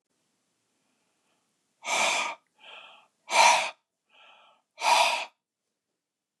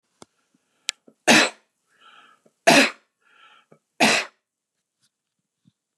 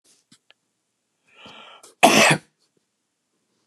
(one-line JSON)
{"exhalation_length": "6.4 s", "exhalation_amplitude": 15344, "exhalation_signal_mean_std_ratio": 0.34, "three_cough_length": "6.0 s", "three_cough_amplitude": 32425, "three_cough_signal_mean_std_ratio": 0.26, "cough_length": "3.7 s", "cough_amplitude": 32767, "cough_signal_mean_std_ratio": 0.25, "survey_phase": "beta (2021-08-13 to 2022-03-07)", "age": "65+", "gender": "Male", "wearing_mask": "No", "symptom_none": true, "smoker_status": "Never smoked", "respiratory_condition_asthma": false, "respiratory_condition_other": false, "recruitment_source": "REACT", "submission_delay": "0 days", "covid_test_result": "Negative", "covid_test_method": "RT-qPCR", "influenza_a_test_result": "Negative", "influenza_b_test_result": "Negative"}